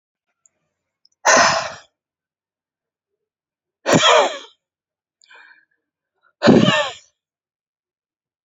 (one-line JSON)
{"exhalation_length": "8.4 s", "exhalation_amplitude": 32768, "exhalation_signal_mean_std_ratio": 0.31, "survey_phase": "beta (2021-08-13 to 2022-03-07)", "age": "45-64", "gender": "Female", "wearing_mask": "No", "symptom_runny_or_blocked_nose": true, "symptom_sore_throat": true, "symptom_onset": "12 days", "smoker_status": "Ex-smoker", "respiratory_condition_asthma": false, "respiratory_condition_other": false, "recruitment_source": "REACT", "submission_delay": "2 days", "covid_test_result": "Negative", "covid_test_method": "RT-qPCR", "influenza_a_test_result": "Negative", "influenza_b_test_result": "Negative"}